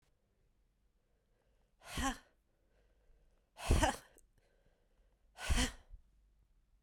{"exhalation_length": "6.8 s", "exhalation_amplitude": 4733, "exhalation_signal_mean_std_ratio": 0.28, "survey_phase": "beta (2021-08-13 to 2022-03-07)", "age": "45-64", "gender": "Female", "wearing_mask": "No", "symptom_new_continuous_cough": true, "symptom_runny_or_blocked_nose": true, "symptom_sore_throat": true, "symptom_fatigue": true, "symptom_headache": true, "symptom_other": true, "smoker_status": "Ex-smoker", "respiratory_condition_asthma": false, "respiratory_condition_other": false, "recruitment_source": "Test and Trace", "submission_delay": "5 days", "covid_test_result": "Negative", "covid_test_method": "RT-qPCR"}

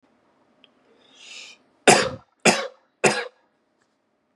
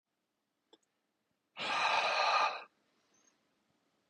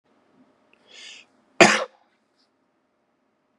{"three_cough_length": "4.4 s", "three_cough_amplitude": 31804, "three_cough_signal_mean_std_ratio": 0.27, "exhalation_length": "4.1 s", "exhalation_amplitude": 3693, "exhalation_signal_mean_std_ratio": 0.41, "cough_length": "3.6 s", "cough_amplitude": 32768, "cough_signal_mean_std_ratio": 0.18, "survey_phase": "beta (2021-08-13 to 2022-03-07)", "age": "18-44", "gender": "Male", "wearing_mask": "No", "symptom_none": true, "smoker_status": "Ex-smoker", "respiratory_condition_asthma": false, "respiratory_condition_other": false, "recruitment_source": "REACT", "submission_delay": "2 days", "covid_test_result": "Negative", "covid_test_method": "RT-qPCR", "influenza_a_test_result": "Negative", "influenza_b_test_result": "Negative"}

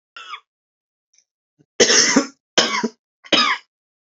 {"cough_length": "4.2 s", "cough_amplitude": 32767, "cough_signal_mean_std_ratio": 0.38, "survey_phase": "alpha (2021-03-01 to 2021-08-12)", "age": "18-44", "gender": "Male", "wearing_mask": "No", "symptom_none": true, "symptom_cough_any": true, "symptom_onset": "4 days", "smoker_status": "Current smoker (1 to 10 cigarettes per day)", "respiratory_condition_asthma": false, "respiratory_condition_other": false, "recruitment_source": "Test and Trace", "submission_delay": "2 days", "covid_test_result": "Positive", "covid_test_method": "RT-qPCR", "covid_ct_value": 14.0, "covid_ct_gene": "ORF1ab gene", "covid_ct_mean": 14.3, "covid_viral_load": "21000000 copies/ml", "covid_viral_load_category": "High viral load (>1M copies/ml)"}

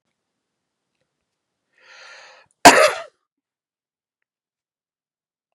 {"cough_length": "5.5 s", "cough_amplitude": 32768, "cough_signal_mean_std_ratio": 0.17, "survey_phase": "beta (2021-08-13 to 2022-03-07)", "age": "18-44", "gender": "Male", "wearing_mask": "No", "symptom_none": true, "smoker_status": "Never smoked", "respiratory_condition_asthma": false, "respiratory_condition_other": false, "recruitment_source": "REACT", "submission_delay": "1 day", "covid_test_result": "Negative", "covid_test_method": "RT-qPCR", "influenza_a_test_result": "Negative", "influenza_b_test_result": "Negative"}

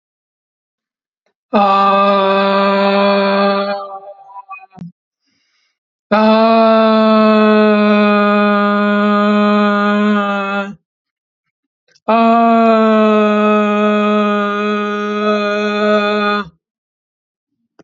{"exhalation_length": "17.8 s", "exhalation_amplitude": 32768, "exhalation_signal_mean_std_ratio": 0.8, "survey_phase": "alpha (2021-03-01 to 2021-08-12)", "age": "45-64", "gender": "Female", "wearing_mask": "No", "symptom_none": true, "smoker_status": "Never smoked", "respiratory_condition_asthma": false, "respiratory_condition_other": false, "recruitment_source": "REACT", "submission_delay": "1 day", "covid_test_result": "Negative", "covid_test_method": "RT-qPCR"}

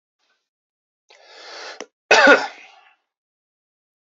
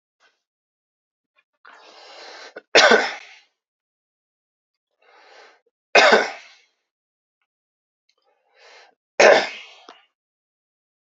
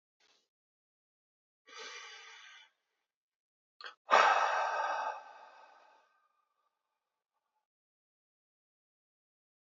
{"cough_length": "4.1 s", "cough_amplitude": 28319, "cough_signal_mean_std_ratio": 0.24, "three_cough_length": "11.0 s", "three_cough_amplitude": 32767, "three_cough_signal_mean_std_ratio": 0.24, "exhalation_length": "9.6 s", "exhalation_amplitude": 8674, "exhalation_signal_mean_std_ratio": 0.26, "survey_phase": "beta (2021-08-13 to 2022-03-07)", "age": "18-44", "gender": "Male", "wearing_mask": "No", "symptom_cough_any": true, "symptom_runny_or_blocked_nose": true, "symptom_headache": true, "symptom_change_to_sense_of_smell_or_taste": true, "symptom_onset": "3 days", "smoker_status": "Ex-smoker", "respiratory_condition_asthma": false, "respiratory_condition_other": false, "recruitment_source": "Test and Trace", "submission_delay": "1 day", "covid_test_result": "Positive", "covid_test_method": "RT-qPCR", "covid_ct_value": 15.9, "covid_ct_gene": "ORF1ab gene"}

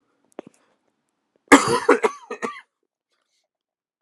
{"cough_length": "4.0 s", "cough_amplitude": 32768, "cough_signal_mean_std_ratio": 0.24, "survey_phase": "alpha (2021-03-01 to 2021-08-12)", "age": "18-44", "gender": "Male", "wearing_mask": "No", "symptom_cough_any": true, "symptom_headache": true, "symptom_change_to_sense_of_smell_or_taste": true, "symptom_onset": "4 days", "smoker_status": "Never smoked", "respiratory_condition_asthma": true, "respiratory_condition_other": false, "recruitment_source": "Test and Trace", "submission_delay": "2 days", "covid_test_result": "Positive", "covid_test_method": "RT-qPCR", "covid_ct_value": 15.1, "covid_ct_gene": "ORF1ab gene", "covid_ct_mean": 16.3, "covid_viral_load": "4400000 copies/ml", "covid_viral_load_category": "High viral load (>1M copies/ml)"}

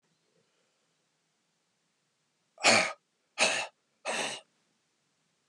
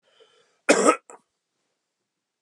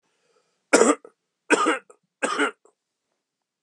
{"exhalation_length": "5.5 s", "exhalation_amplitude": 11783, "exhalation_signal_mean_std_ratio": 0.28, "cough_length": "2.4 s", "cough_amplitude": 28659, "cough_signal_mean_std_ratio": 0.25, "three_cough_length": "3.6 s", "three_cough_amplitude": 26161, "three_cough_signal_mean_std_ratio": 0.34, "survey_phase": "beta (2021-08-13 to 2022-03-07)", "age": "45-64", "gender": "Male", "wearing_mask": "No", "symptom_sore_throat": true, "symptom_onset": "4 days", "smoker_status": "Never smoked", "respiratory_condition_asthma": false, "respiratory_condition_other": false, "recruitment_source": "Test and Trace", "submission_delay": "0 days", "covid_test_result": "Negative", "covid_test_method": "RT-qPCR"}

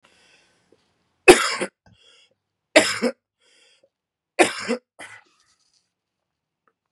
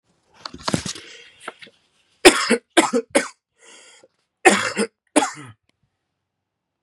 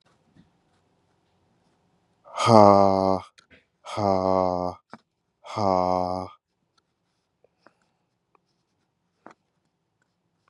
{"three_cough_length": "6.9 s", "three_cough_amplitude": 32768, "three_cough_signal_mean_std_ratio": 0.22, "cough_length": "6.8 s", "cough_amplitude": 32768, "cough_signal_mean_std_ratio": 0.3, "exhalation_length": "10.5 s", "exhalation_amplitude": 30325, "exhalation_signal_mean_std_ratio": 0.27, "survey_phase": "beta (2021-08-13 to 2022-03-07)", "age": "18-44", "gender": "Male", "wearing_mask": "No", "symptom_new_continuous_cough": true, "symptom_runny_or_blocked_nose": true, "symptom_change_to_sense_of_smell_or_taste": true, "symptom_onset": "3 days", "smoker_status": "Ex-smoker", "respiratory_condition_asthma": false, "respiratory_condition_other": false, "recruitment_source": "Test and Trace", "submission_delay": "2 days", "covid_test_result": "Positive", "covid_test_method": "RT-qPCR", "covid_ct_value": 19.6, "covid_ct_gene": "N gene"}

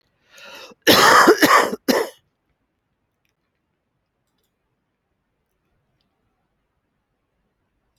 {"cough_length": "8.0 s", "cough_amplitude": 29821, "cough_signal_mean_std_ratio": 0.28, "survey_phase": "alpha (2021-03-01 to 2021-08-12)", "age": "45-64", "gender": "Female", "wearing_mask": "No", "symptom_none": true, "smoker_status": "Current smoker (1 to 10 cigarettes per day)", "respiratory_condition_asthma": false, "respiratory_condition_other": false, "recruitment_source": "Test and Trace", "submission_delay": "0 days", "covid_test_result": "Negative", "covid_test_method": "LFT"}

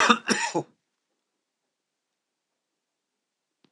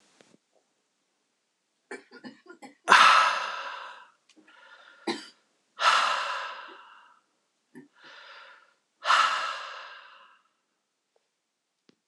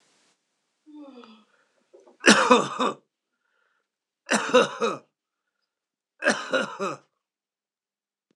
{"cough_length": "3.7 s", "cough_amplitude": 23646, "cough_signal_mean_std_ratio": 0.25, "exhalation_length": "12.1 s", "exhalation_amplitude": 26028, "exhalation_signal_mean_std_ratio": 0.32, "three_cough_length": "8.4 s", "three_cough_amplitude": 25740, "three_cough_signal_mean_std_ratio": 0.31, "survey_phase": "beta (2021-08-13 to 2022-03-07)", "age": "45-64", "gender": "Male", "wearing_mask": "No", "symptom_cough_any": true, "symptom_sore_throat": true, "symptom_diarrhoea": true, "symptom_fatigue": true, "symptom_fever_high_temperature": true, "symptom_headache": true, "smoker_status": "Ex-smoker", "respiratory_condition_asthma": false, "respiratory_condition_other": false, "recruitment_source": "Test and Trace", "submission_delay": "2 days", "covid_test_method": "PCR", "covid_ct_value": 34.9, "covid_ct_gene": "N gene"}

